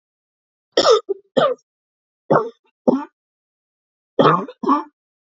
{"three_cough_length": "5.2 s", "three_cough_amplitude": 29015, "three_cough_signal_mean_std_ratio": 0.37, "survey_phase": "beta (2021-08-13 to 2022-03-07)", "age": "18-44", "gender": "Female", "wearing_mask": "No", "symptom_cough_any": true, "symptom_fatigue": true, "symptom_fever_high_temperature": true, "symptom_headache": true, "symptom_change_to_sense_of_smell_or_taste": true, "symptom_onset": "2 days", "smoker_status": "Never smoked", "respiratory_condition_asthma": true, "respiratory_condition_other": false, "recruitment_source": "Test and Trace", "submission_delay": "2 days", "covid_test_result": "Positive", "covid_test_method": "RT-qPCR", "covid_ct_value": 17.2, "covid_ct_gene": "N gene"}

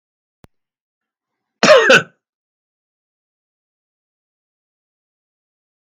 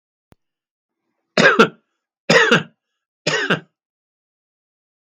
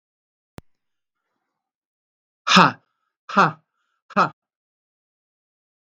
{"cough_length": "5.9 s", "cough_amplitude": 32768, "cough_signal_mean_std_ratio": 0.2, "three_cough_length": "5.1 s", "three_cough_amplitude": 32768, "three_cough_signal_mean_std_ratio": 0.31, "exhalation_length": "6.0 s", "exhalation_amplitude": 32766, "exhalation_signal_mean_std_ratio": 0.21, "survey_phase": "beta (2021-08-13 to 2022-03-07)", "age": "65+", "gender": "Male", "wearing_mask": "No", "symptom_none": true, "smoker_status": "Never smoked", "respiratory_condition_asthma": false, "respiratory_condition_other": false, "recruitment_source": "REACT", "submission_delay": "1 day", "covid_test_result": "Negative", "covid_test_method": "RT-qPCR", "influenza_a_test_result": "Unknown/Void", "influenza_b_test_result": "Unknown/Void"}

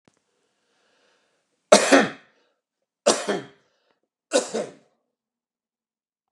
{"three_cough_length": "6.3 s", "three_cough_amplitude": 32768, "three_cough_signal_mean_std_ratio": 0.25, "survey_phase": "beta (2021-08-13 to 2022-03-07)", "age": "45-64", "gender": "Male", "wearing_mask": "No", "symptom_none": true, "smoker_status": "Never smoked", "respiratory_condition_asthma": false, "respiratory_condition_other": false, "recruitment_source": "REACT", "submission_delay": "5 days", "covid_test_result": "Negative", "covid_test_method": "RT-qPCR", "influenza_a_test_result": "Negative", "influenza_b_test_result": "Negative"}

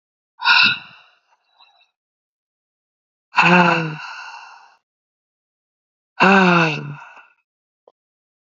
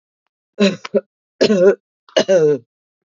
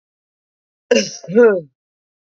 {"exhalation_length": "8.4 s", "exhalation_amplitude": 31029, "exhalation_signal_mean_std_ratio": 0.35, "three_cough_length": "3.1 s", "three_cough_amplitude": 28211, "three_cough_signal_mean_std_ratio": 0.47, "cough_length": "2.2 s", "cough_amplitude": 28422, "cough_signal_mean_std_ratio": 0.37, "survey_phase": "beta (2021-08-13 to 2022-03-07)", "age": "18-44", "gender": "Female", "wearing_mask": "No", "symptom_new_continuous_cough": true, "symptom_runny_or_blocked_nose": true, "symptom_shortness_of_breath": true, "symptom_sore_throat": true, "symptom_abdominal_pain": true, "symptom_fatigue": true, "symptom_fever_high_temperature": true, "symptom_headache": true, "symptom_loss_of_taste": true, "symptom_onset": "3 days", "smoker_status": "Ex-smoker", "respiratory_condition_asthma": false, "respiratory_condition_other": false, "recruitment_source": "Test and Trace", "submission_delay": "2 days", "covid_test_result": "Positive", "covid_test_method": "RT-qPCR"}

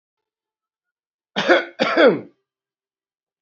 {"cough_length": "3.4 s", "cough_amplitude": 32767, "cough_signal_mean_std_ratio": 0.32, "survey_phase": "beta (2021-08-13 to 2022-03-07)", "age": "18-44", "gender": "Male", "wearing_mask": "No", "symptom_none": true, "smoker_status": "Ex-smoker", "respiratory_condition_asthma": false, "respiratory_condition_other": false, "recruitment_source": "REACT", "submission_delay": "3 days", "covid_test_result": "Negative", "covid_test_method": "RT-qPCR"}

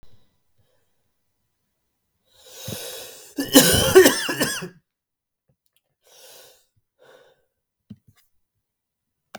{"cough_length": "9.4 s", "cough_amplitude": 32768, "cough_signal_mean_std_ratio": 0.25, "survey_phase": "beta (2021-08-13 to 2022-03-07)", "age": "18-44", "gender": "Male", "wearing_mask": "No", "symptom_cough_any": true, "symptom_new_continuous_cough": true, "symptom_runny_or_blocked_nose": true, "symptom_fever_high_temperature": true, "smoker_status": "Never smoked", "respiratory_condition_asthma": false, "respiratory_condition_other": false, "recruitment_source": "Test and Trace", "submission_delay": "1 day", "covid_test_result": "Positive", "covid_test_method": "LAMP"}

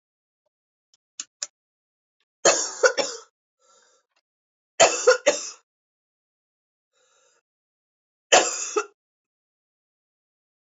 {"three_cough_length": "10.7 s", "three_cough_amplitude": 26201, "three_cough_signal_mean_std_ratio": 0.25, "survey_phase": "beta (2021-08-13 to 2022-03-07)", "age": "45-64", "gender": "Female", "wearing_mask": "No", "symptom_new_continuous_cough": true, "symptom_runny_or_blocked_nose": true, "symptom_sore_throat": true, "symptom_fatigue": true, "symptom_headache": true, "smoker_status": "Never smoked", "respiratory_condition_asthma": false, "respiratory_condition_other": false, "recruitment_source": "Test and Trace", "submission_delay": "2 days", "covid_test_result": "Positive", "covid_test_method": "LFT"}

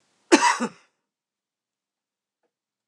{"cough_length": "2.9 s", "cough_amplitude": 25767, "cough_signal_mean_std_ratio": 0.23, "survey_phase": "beta (2021-08-13 to 2022-03-07)", "age": "65+", "gender": "Male", "wearing_mask": "No", "symptom_cough_any": true, "smoker_status": "Never smoked", "respiratory_condition_asthma": false, "respiratory_condition_other": false, "recruitment_source": "REACT", "submission_delay": "2 days", "covid_test_result": "Negative", "covid_test_method": "RT-qPCR", "influenza_a_test_result": "Negative", "influenza_b_test_result": "Negative"}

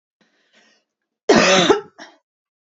{"cough_length": "2.7 s", "cough_amplitude": 28857, "cough_signal_mean_std_ratio": 0.35, "survey_phase": "beta (2021-08-13 to 2022-03-07)", "age": "18-44", "gender": "Female", "wearing_mask": "No", "symptom_cough_any": true, "symptom_onset": "2 days", "smoker_status": "Never smoked", "respiratory_condition_asthma": false, "respiratory_condition_other": false, "recruitment_source": "REACT", "submission_delay": "1 day", "covid_test_result": "Negative", "covid_test_method": "RT-qPCR", "influenza_a_test_result": "Negative", "influenza_b_test_result": "Negative"}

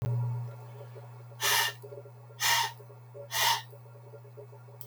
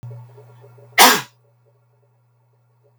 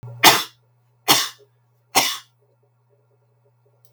{"exhalation_length": "4.9 s", "exhalation_amplitude": 7843, "exhalation_signal_mean_std_ratio": 0.6, "cough_length": "3.0 s", "cough_amplitude": 32768, "cough_signal_mean_std_ratio": 0.24, "three_cough_length": "3.9 s", "three_cough_amplitude": 32768, "three_cough_signal_mean_std_ratio": 0.29, "survey_phase": "beta (2021-08-13 to 2022-03-07)", "age": "45-64", "gender": "Male", "wearing_mask": "No", "symptom_none": true, "smoker_status": "Ex-smoker", "respiratory_condition_asthma": false, "respiratory_condition_other": false, "recruitment_source": "REACT", "submission_delay": "6 days", "covid_test_result": "Negative", "covid_test_method": "RT-qPCR", "influenza_a_test_result": "Negative", "influenza_b_test_result": "Negative"}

